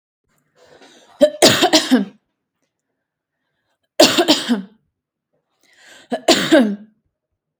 three_cough_length: 7.6 s
three_cough_amplitude: 32768
three_cough_signal_mean_std_ratio: 0.36
survey_phase: beta (2021-08-13 to 2022-03-07)
age: 18-44
gender: Female
wearing_mask: 'No'
symptom_none: true
smoker_status: Never smoked
respiratory_condition_asthma: false
respiratory_condition_other: false
recruitment_source: REACT
submission_delay: 1 day
covid_test_result: Negative
covid_test_method: RT-qPCR
influenza_a_test_result: Negative
influenza_b_test_result: Negative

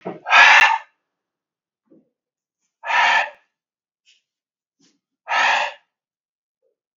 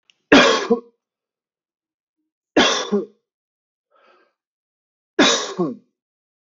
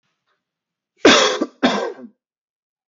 exhalation_length: 7.0 s
exhalation_amplitude: 32767
exhalation_signal_mean_std_ratio: 0.33
three_cough_length: 6.4 s
three_cough_amplitude: 32768
three_cough_signal_mean_std_ratio: 0.33
cough_length: 2.9 s
cough_amplitude: 32768
cough_signal_mean_std_ratio: 0.35
survey_phase: beta (2021-08-13 to 2022-03-07)
age: 45-64
gender: Male
wearing_mask: 'No'
symptom_none: true
smoker_status: Never smoked
respiratory_condition_asthma: false
respiratory_condition_other: false
recruitment_source: REACT
submission_delay: 7 days
covid_test_result: Negative
covid_test_method: RT-qPCR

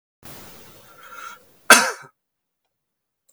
cough_length: 3.3 s
cough_amplitude: 32768
cough_signal_mean_std_ratio: 0.21
survey_phase: beta (2021-08-13 to 2022-03-07)
age: 18-44
gender: Male
wearing_mask: 'No'
symptom_none: true
smoker_status: Never smoked
respiratory_condition_asthma: false
respiratory_condition_other: false
recruitment_source: REACT
submission_delay: 1 day
covid_test_result: Negative
covid_test_method: RT-qPCR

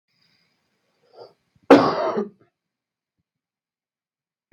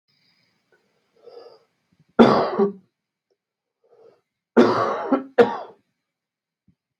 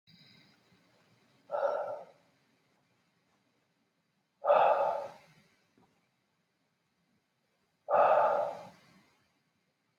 cough_length: 4.5 s
cough_amplitude: 32768
cough_signal_mean_std_ratio: 0.22
three_cough_length: 7.0 s
three_cough_amplitude: 32768
three_cough_signal_mean_std_ratio: 0.3
exhalation_length: 10.0 s
exhalation_amplitude: 7588
exhalation_signal_mean_std_ratio: 0.33
survey_phase: beta (2021-08-13 to 2022-03-07)
age: 18-44
gender: Male
wearing_mask: 'No'
symptom_cough_any: true
symptom_sore_throat: true
symptom_fatigue: true
symptom_headache: true
smoker_status: Never smoked
respiratory_condition_asthma: false
respiratory_condition_other: false
recruitment_source: Test and Trace
submission_delay: 2 days
covid_test_result: Positive
covid_test_method: RT-qPCR
covid_ct_value: 33.1
covid_ct_gene: N gene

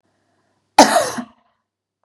cough_length: 2.0 s
cough_amplitude: 32768
cough_signal_mean_std_ratio: 0.29
survey_phase: beta (2021-08-13 to 2022-03-07)
age: 18-44
gender: Female
wearing_mask: 'No'
symptom_none: true
smoker_status: Ex-smoker
respiratory_condition_asthma: false
respiratory_condition_other: false
recruitment_source: REACT
submission_delay: 6 days
covid_test_result: Negative
covid_test_method: RT-qPCR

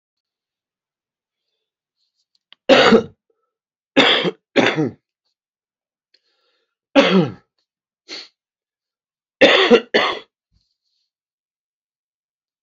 three_cough_length: 12.6 s
three_cough_amplitude: 32768
three_cough_signal_mean_std_ratio: 0.3
survey_phase: beta (2021-08-13 to 2022-03-07)
age: 65+
gender: Male
wearing_mask: 'No'
symptom_cough_any: true
symptom_runny_or_blocked_nose: true
symptom_sore_throat: true
symptom_diarrhoea: true
symptom_fatigue: true
symptom_headache: true
symptom_onset: 3 days
smoker_status: Ex-smoker
respiratory_condition_asthma: true
respiratory_condition_other: false
recruitment_source: REACT
submission_delay: 2 days
covid_test_result: Positive
covid_test_method: RT-qPCR
covid_ct_value: 13.9
covid_ct_gene: E gene
influenza_a_test_result: Negative
influenza_b_test_result: Negative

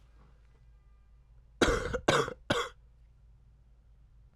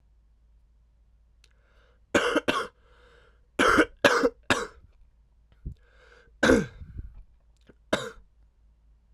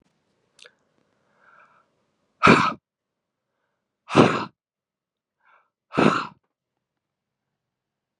three_cough_length: 4.4 s
three_cough_amplitude: 11669
three_cough_signal_mean_std_ratio: 0.35
cough_length: 9.1 s
cough_amplitude: 20969
cough_signal_mean_std_ratio: 0.33
exhalation_length: 8.2 s
exhalation_amplitude: 31210
exhalation_signal_mean_std_ratio: 0.23
survey_phase: alpha (2021-03-01 to 2021-08-12)
age: 18-44
gender: Male
wearing_mask: 'No'
symptom_cough_any: true
symptom_new_continuous_cough: true
symptom_onset: 5 days
smoker_status: Never smoked
respiratory_condition_asthma: false
respiratory_condition_other: false
recruitment_source: Test and Trace
submission_delay: 2 days
covid_test_result: Positive
covid_test_method: RT-qPCR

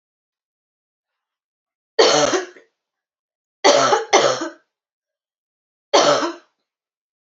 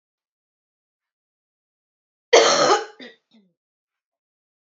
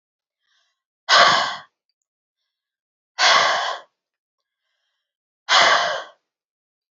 three_cough_length: 7.3 s
three_cough_amplitude: 32585
three_cough_signal_mean_std_ratio: 0.36
cough_length: 4.6 s
cough_amplitude: 28771
cough_signal_mean_std_ratio: 0.25
exhalation_length: 6.9 s
exhalation_amplitude: 30335
exhalation_signal_mean_std_ratio: 0.36
survey_phase: beta (2021-08-13 to 2022-03-07)
age: 18-44
gender: Female
wearing_mask: 'No'
symptom_cough_any: true
symptom_sore_throat: true
symptom_fatigue: true
symptom_fever_high_temperature: true
symptom_onset: 2 days
smoker_status: Never smoked
respiratory_condition_asthma: false
respiratory_condition_other: false
recruitment_source: Test and Trace
submission_delay: 2 days
covid_test_result: Positive
covid_test_method: RT-qPCR
covid_ct_value: 32.4
covid_ct_gene: N gene
covid_ct_mean: 32.5
covid_viral_load: 21 copies/ml
covid_viral_load_category: Minimal viral load (< 10K copies/ml)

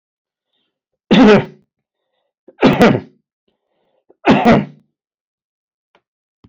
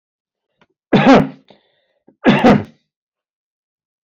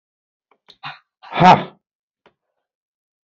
three_cough_length: 6.5 s
three_cough_amplitude: 28291
three_cough_signal_mean_std_ratio: 0.34
cough_length: 4.1 s
cough_amplitude: 32767
cough_signal_mean_std_ratio: 0.33
exhalation_length: 3.2 s
exhalation_amplitude: 30496
exhalation_signal_mean_std_ratio: 0.22
survey_phase: beta (2021-08-13 to 2022-03-07)
age: 65+
gender: Male
wearing_mask: 'No'
symptom_none: true
smoker_status: Never smoked
respiratory_condition_asthma: false
respiratory_condition_other: false
recruitment_source: REACT
submission_delay: 1 day
covid_test_result: Negative
covid_test_method: RT-qPCR
influenza_a_test_result: Negative
influenza_b_test_result: Negative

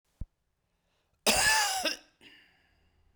cough_length: 3.2 s
cough_amplitude: 10310
cough_signal_mean_std_ratio: 0.39
survey_phase: beta (2021-08-13 to 2022-03-07)
age: 65+
gender: Male
wearing_mask: 'No'
symptom_cough_any: true
symptom_shortness_of_breath: true
symptom_fatigue: true
symptom_headache: true
symptom_change_to_sense_of_smell_or_taste: true
symptom_loss_of_taste: true
symptom_onset: 5 days
smoker_status: Ex-smoker
respiratory_condition_asthma: false
respiratory_condition_other: false
recruitment_source: Test and Trace
submission_delay: 2 days
covid_test_result: Positive
covid_test_method: ePCR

